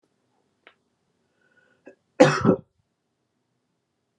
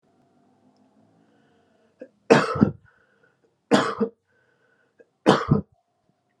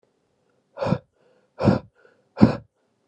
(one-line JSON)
{"cough_length": "4.2 s", "cough_amplitude": 30083, "cough_signal_mean_std_ratio": 0.2, "three_cough_length": "6.4 s", "three_cough_amplitude": 32370, "three_cough_signal_mean_std_ratio": 0.27, "exhalation_length": "3.1 s", "exhalation_amplitude": 32768, "exhalation_signal_mean_std_ratio": 0.28, "survey_phase": "alpha (2021-03-01 to 2021-08-12)", "age": "18-44", "gender": "Male", "wearing_mask": "No", "symptom_none": true, "smoker_status": "Never smoked", "respiratory_condition_asthma": false, "respiratory_condition_other": false, "recruitment_source": "Test and Trace", "submission_delay": "2 days", "covid_test_result": "Positive", "covid_test_method": "RT-qPCR", "covid_ct_value": 30.6, "covid_ct_gene": "ORF1ab gene"}